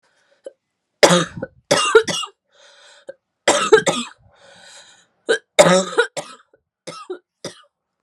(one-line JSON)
{"three_cough_length": "8.0 s", "three_cough_amplitude": 32768, "three_cough_signal_mean_std_ratio": 0.35, "survey_phase": "alpha (2021-03-01 to 2021-08-12)", "age": "18-44", "gender": "Female", "wearing_mask": "No", "symptom_cough_any": true, "symptom_onset": "8 days", "smoker_status": "Never smoked", "respiratory_condition_asthma": false, "respiratory_condition_other": true, "recruitment_source": "Test and Trace", "submission_delay": "2 days", "covid_test_result": "Positive", "covid_test_method": "RT-qPCR"}